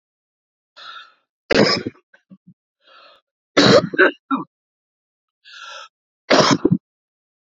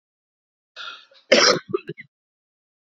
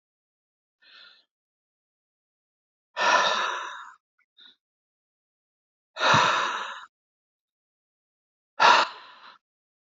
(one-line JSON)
{"three_cough_length": "7.5 s", "three_cough_amplitude": 30832, "three_cough_signal_mean_std_ratio": 0.32, "cough_length": "3.0 s", "cough_amplitude": 28350, "cough_signal_mean_std_ratio": 0.27, "exhalation_length": "9.9 s", "exhalation_amplitude": 21131, "exhalation_signal_mean_std_ratio": 0.31, "survey_phase": "beta (2021-08-13 to 2022-03-07)", "age": "45-64", "gender": "Male", "wearing_mask": "No", "symptom_cough_any": true, "symptom_runny_or_blocked_nose": true, "symptom_shortness_of_breath": true, "symptom_fatigue": true, "symptom_fever_high_temperature": true, "symptom_headache": true, "smoker_status": "Ex-smoker", "respiratory_condition_asthma": false, "respiratory_condition_other": false, "recruitment_source": "Test and Trace", "submission_delay": "1 day", "covid_test_result": "Positive", "covid_test_method": "LFT"}